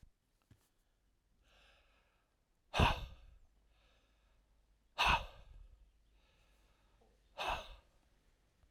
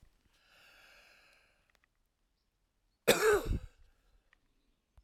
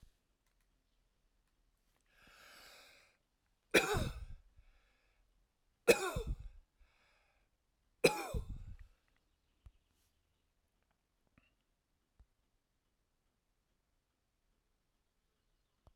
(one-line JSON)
{"exhalation_length": "8.7 s", "exhalation_amplitude": 4373, "exhalation_signal_mean_std_ratio": 0.25, "cough_length": "5.0 s", "cough_amplitude": 8075, "cough_signal_mean_std_ratio": 0.25, "three_cough_length": "16.0 s", "three_cough_amplitude": 7036, "three_cough_signal_mean_std_ratio": 0.2, "survey_phase": "alpha (2021-03-01 to 2021-08-12)", "age": "45-64", "gender": "Male", "wearing_mask": "No", "symptom_cough_any": true, "symptom_change_to_sense_of_smell_or_taste": true, "symptom_onset": "5 days", "smoker_status": "Never smoked", "respiratory_condition_asthma": true, "respiratory_condition_other": false, "recruitment_source": "Test and Trace", "submission_delay": "2 days", "covid_test_result": "Positive", "covid_test_method": "RT-qPCR", "covid_ct_value": 18.9, "covid_ct_gene": "N gene"}